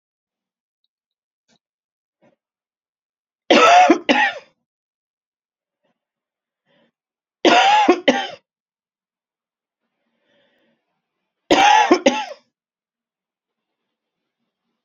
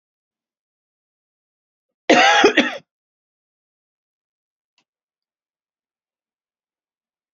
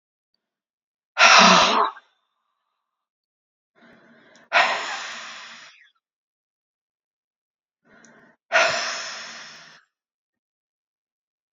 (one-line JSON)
{"three_cough_length": "14.8 s", "three_cough_amplitude": 31845, "three_cough_signal_mean_std_ratio": 0.3, "cough_length": "7.3 s", "cough_amplitude": 29323, "cough_signal_mean_std_ratio": 0.22, "exhalation_length": "11.5 s", "exhalation_amplitude": 30222, "exhalation_signal_mean_std_ratio": 0.29, "survey_phase": "beta (2021-08-13 to 2022-03-07)", "age": "45-64", "gender": "Female", "wearing_mask": "No", "symptom_cough_any": true, "symptom_runny_or_blocked_nose": true, "symptom_onset": "12 days", "smoker_status": "Ex-smoker", "respiratory_condition_asthma": false, "respiratory_condition_other": false, "recruitment_source": "REACT", "submission_delay": "1 day", "covid_test_result": "Negative", "covid_test_method": "RT-qPCR", "influenza_a_test_result": "Negative", "influenza_b_test_result": "Negative"}